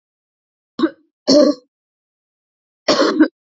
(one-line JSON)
{"three_cough_length": "3.6 s", "three_cough_amplitude": 29273, "three_cough_signal_mean_std_ratio": 0.36, "survey_phase": "alpha (2021-03-01 to 2021-08-12)", "age": "18-44", "gender": "Female", "wearing_mask": "No", "symptom_cough_any": true, "symptom_diarrhoea": true, "symptom_fatigue": true, "symptom_change_to_sense_of_smell_or_taste": true, "symptom_onset": "4 days", "smoker_status": "Never smoked", "respiratory_condition_asthma": false, "respiratory_condition_other": false, "recruitment_source": "Test and Trace", "submission_delay": "2 days", "covid_test_result": "Positive", "covid_test_method": "RT-qPCR", "covid_ct_value": 18.5, "covid_ct_gene": "ORF1ab gene"}